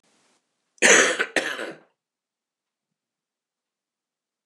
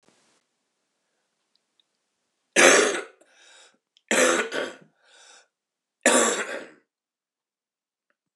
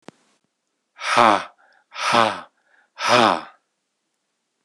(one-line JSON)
{"cough_length": "4.5 s", "cough_amplitude": 26092, "cough_signal_mean_std_ratio": 0.27, "three_cough_length": "8.4 s", "three_cough_amplitude": 26024, "three_cough_signal_mean_std_ratio": 0.31, "exhalation_length": "4.6 s", "exhalation_amplitude": 26058, "exhalation_signal_mean_std_ratio": 0.35, "survey_phase": "alpha (2021-03-01 to 2021-08-12)", "age": "45-64", "gender": "Male", "wearing_mask": "No", "symptom_cough_any": true, "symptom_fatigue": true, "symptom_fever_high_temperature": true, "smoker_status": "Never smoked", "respiratory_condition_asthma": false, "respiratory_condition_other": false, "recruitment_source": "Test and Trace", "submission_delay": "1 day", "covid_test_result": "Positive", "covid_test_method": "RT-qPCR", "covid_ct_value": 18.5, "covid_ct_gene": "ORF1ab gene"}